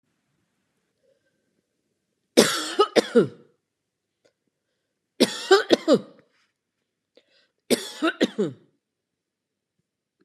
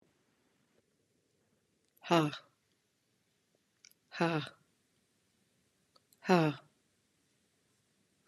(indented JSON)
{
  "three_cough_length": "10.2 s",
  "three_cough_amplitude": 31110,
  "three_cough_signal_mean_std_ratio": 0.27,
  "exhalation_length": "8.3 s",
  "exhalation_amplitude": 9330,
  "exhalation_signal_mean_std_ratio": 0.21,
  "survey_phase": "beta (2021-08-13 to 2022-03-07)",
  "age": "45-64",
  "gender": "Female",
  "wearing_mask": "No",
  "symptom_none": true,
  "smoker_status": "Ex-smoker",
  "respiratory_condition_asthma": false,
  "respiratory_condition_other": false,
  "recruitment_source": "REACT",
  "submission_delay": "2 days",
  "covid_test_result": "Negative",
  "covid_test_method": "RT-qPCR",
  "influenza_a_test_result": "Negative",
  "influenza_b_test_result": "Negative"
}